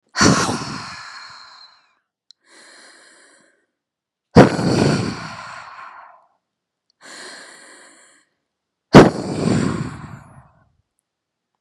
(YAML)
exhalation_length: 11.6 s
exhalation_amplitude: 32768
exhalation_signal_mean_std_ratio: 0.3
survey_phase: beta (2021-08-13 to 2022-03-07)
age: 18-44
gender: Female
wearing_mask: 'No'
symptom_sore_throat: true
symptom_headache: true
symptom_change_to_sense_of_smell_or_taste: true
symptom_onset: 2 days
smoker_status: Never smoked
respiratory_condition_asthma: true
respiratory_condition_other: false
recruitment_source: REACT
submission_delay: 1 day
covid_test_result: Negative
covid_test_method: RT-qPCR
influenza_a_test_result: Negative
influenza_b_test_result: Negative